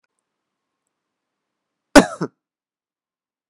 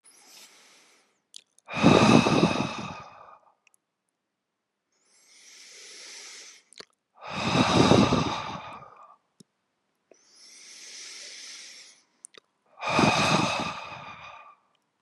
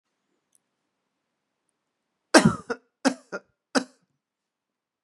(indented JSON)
{
  "cough_length": "3.5 s",
  "cough_amplitude": 32768,
  "cough_signal_mean_std_ratio": 0.14,
  "exhalation_length": "15.0 s",
  "exhalation_amplitude": 22890,
  "exhalation_signal_mean_std_ratio": 0.38,
  "three_cough_length": "5.0 s",
  "three_cough_amplitude": 32552,
  "three_cough_signal_mean_std_ratio": 0.19,
  "survey_phase": "beta (2021-08-13 to 2022-03-07)",
  "age": "18-44",
  "gender": "Male",
  "wearing_mask": "No",
  "symptom_none": true,
  "smoker_status": "Never smoked",
  "respiratory_condition_asthma": false,
  "respiratory_condition_other": false,
  "recruitment_source": "REACT",
  "submission_delay": "1 day",
  "covid_test_result": "Negative",
  "covid_test_method": "RT-qPCR"
}